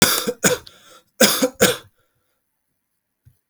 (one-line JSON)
{"cough_length": "3.5 s", "cough_amplitude": 32768, "cough_signal_mean_std_ratio": 0.37, "survey_phase": "alpha (2021-03-01 to 2021-08-12)", "age": "18-44", "gender": "Male", "wearing_mask": "No", "symptom_cough_any": true, "symptom_fever_high_temperature": true, "symptom_onset": "3 days", "smoker_status": "Never smoked", "respiratory_condition_asthma": false, "respiratory_condition_other": false, "recruitment_source": "Test and Trace", "submission_delay": "2 days", "covid_test_result": "Positive", "covid_test_method": "RT-qPCR", "covid_ct_value": 19.1, "covid_ct_gene": "ORF1ab gene", "covid_ct_mean": 21.3, "covid_viral_load": "100000 copies/ml", "covid_viral_load_category": "Low viral load (10K-1M copies/ml)"}